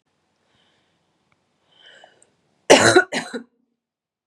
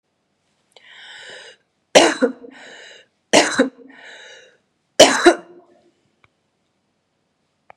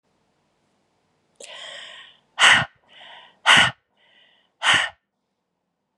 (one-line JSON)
{"cough_length": "4.3 s", "cough_amplitude": 32768, "cough_signal_mean_std_ratio": 0.24, "three_cough_length": "7.8 s", "three_cough_amplitude": 32768, "three_cough_signal_mean_std_ratio": 0.27, "exhalation_length": "6.0 s", "exhalation_amplitude": 31333, "exhalation_signal_mean_std_ratio": 0.29, "survey_phase": "beta (2021-08-13 to 2022-03-07)", "age": "45-64", "gender": "Female", "wearing_mask": "No", "symptom_cough_any": true, "symptom_runny_or_blocked_nose": true, "symptom_sore_throat": true, "symptom_onset": "3 days", "smoker_status": "Never smoked", "respiratory_condition_asthma": false, "respiratory_condition_other": false, "recruitment_source": "Test and Trace", "submission_delay": "1 day", "covid_test_result": "Positive", "covid_test_method": "RT-qPCR", "covid_ct_value": 29.0, "covid_ct_gene": "ORF1ab gene", "covid_ct_mean": 29.7, "covid_viral_load": "180 copies/ml", "covid_viral_load_category": "Minimal viral load (< 10K copies/ml)"}